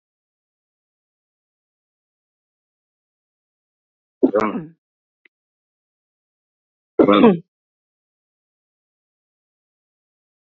{"cough_length": "10.6 s", "cough_amplitude": 32768, "cough_signal_mean_std_ratio": 0.18, "survey_phase": "beta (2021-08-13 to 2022-03-07)", "age": "65+", "gender": "Female", "wearing_mask": "No", "symptom_cough_any": true, "symptom_runny_or_blocked_nose": true, "symptom_sore_throat": true, "symptom_change_to_sense_of_smell_or_taste": true, "symptom_onset": "7 days", "smoker_status": "Ex-smoker", "respiratory_condition_asthma": false, "respiratory_condition_other": true, "recruitment_source": "Test and Trace", "submission_delay": "1 day", "covid_test_result": "Positive", "covid_test_method": "RT-qPCR", "covid_ct_value": 18.2, "covid_ct_gene": "ORF1ab gene", "covid_ct_mean": 19.1, "covid_viral_load": "530000 copies/ml", "covid_viral_load_category": "Low viral load (10K-1M copies/ml)"}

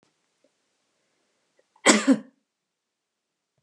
{"cough_length": "3.6 s", "cough_amplitude": 29458, "cough_signal_mean_std_ratio": 0.21, "survey_phase": "beta (2021-08-13 to 2022-03-07)", "age": "65+", "gender": "Female", "wearing_mask": "No", "symptom_none": true, "smoker_status": "Never smoked", "respiratory_condition_asthma": false, "respiratory_condition_other": false, "recruitment_source": "Test and Trace", "submission_delay": "-1 day", "covid_test_result": "Negative", "covid_test_method": "LFT"}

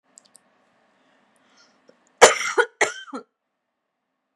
{"cough_length": "4.4 s", "cough_amplitude": 32768, "cough_signal_mean_std_ratio": 0.21, "survey_phase": "beta (2021-08-13 to 2022-03-07)", "age": "18-44", "gender": "Female", "wearing_mask": "No", "symptom_none": true, "smoker_status": "Ex-smoker", "respiratory_condition_asthma": false, "respiratory_condition_other": false, "recruitment_source": "REACT", "submission_delay": "2 days", "covid_test_result": "Negative", "covid_test_method": "RT-qPCR", "influenza_a_test_result": "Negative", "influenza_b_test_result": "Negative"}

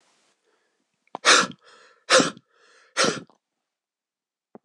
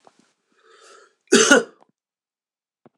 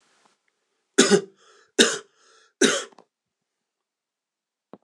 {"exhalation_length": "4.6 s", "exhalation_amplitude": 25055, "exhalation_signal_mean_std_ratio": 0.28, "cough_length": "3.0 s", "cough_amplitude": 26028, "cough_signal_mean_std_ratio": 0.25, "three_cough_length": "4.8 s", "three_cough_amplitude": 26028, "three_cough_signal_mean_std_ratio": 0.26, "survey_phase": "beta (2021-08-13 to 2022-03-07)", "age": "45-64", "gender": "Male", "wearing_mask": "No", "symptom_cough_any": true, "symptom_runny_or_blocked_nose": true, "symptom_sore_throat": true, "symptom_onset": "2 days", "smoker_status": "Ex-smoker", "respiratory_condition_asthma": false, "respiratory_condition_other": false, "recruitment_source": "Test and Trace", "submission_delay": "1 day", "covid_test_result": "Positive", "covid_test_method": "RT-qPCR"}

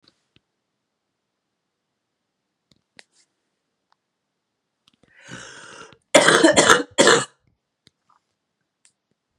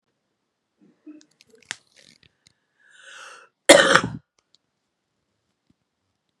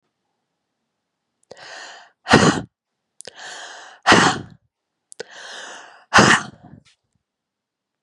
{"three_cough_length": "9.4 s", "three_cough_amplitude": 32768, "three_cough_signal_mean_std_ratio": 0.24, "cough_length": "6.4 s", "cough_amplitude": 32768, "cough_signal_mean_std_ratio": 0.18, "exhalation_length": "8.0 s", "exhalation_amplitude": 32768, "exhalation_signal_mean_std_ratio": 0.29, "survey_phase": "beta (2021-08-13 to 2022-03-07)", "age": "18-44", "gender": "Female", "wearing_mask": "No", "symptom_cough_any": true, "symptom_runny_or_blocked_nose": true, "symptom_fatigue": true, "symptom_headache": true, "symptom_onset": "4 days", "smoker_status": "Never smoked", "respiratory_condition_asthma": false, "respiratory_condition_other": false, "recruitment_source": "Test and Trace", "submission_delay": "2 days", "covid_test_result": "Positive", "covid_test_method": "RT-qPCR", "covid_ct_value": 17.3, "covid_ct_gene": "ORF1ab gene", "covid_ct_mean": 17.7, "covid_viral_load": "1600000 copies/ml", "covid_viral_load_category": "High viral load (>1M copies/ml)"}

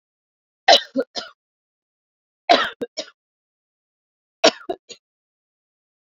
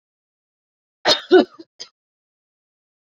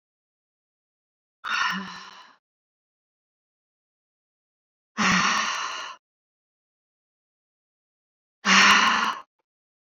{"three_cough_length": "6.1 s", "three_cough_amplitude": 31806, "three_cough_signal_mean_std_ratio": 0.22, "cough_length": "3.2 s", "cough_amplitude": 27162, "cough_signal_mean_std_ratio": 0.22, "exhalation_length": "10.0 s", "exhalation_amplitude": 22254, "exhalation_signal_mean_std_ratio": 0.33, "survey_phase": "beta (2021-08-13 to 2022-03-07)", "age": "18-44", "gender": "Female", "wearing_mask": "No", "symptom_none": true, "symptom_onset": "13 days", "smoker_status": "Never smoked", "respiratory_condition_asthma": false, "respiratory_condition_other": false, "recruitment_source": "REACT", "submission_delay": "2 days", "covid_test_result": "Negative", "covid_test_method": "RT-qPCR"}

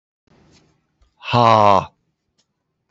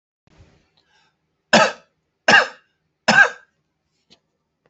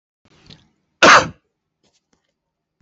{"exhalation_length": "2.9 s", "exhalation_amplitude": 28031, "exhalation_signal_mean_std_ratio": 0.3, "three_cough_length": "4.7 s", "three_cough_amplitude": 29477, "three_cough_signal_mean_std_ratio": 0.27, "cough_length": "2.8 s", "cough_amplitude": 29556, "cough_signal_mean_std_ratio": 0.24, "survey_phase": "beta (2021-08-13 to 2022-03-07)", "age": "45-64", "gender": "Male", "wearing_mask": "No", "symptom_none": true, "smoker_status": "Ex-smoker", "respiratory_condition_asthma": false, "respiratory_condition_other": false, "recruitment_source": "REACT", "submission_delay": "2 days", "covid_test_result": "Negative", "covid_test_method": "RT-qPCR", "influenza_a_test_result": "Negative", "influenza_b_test_result": "Negative"}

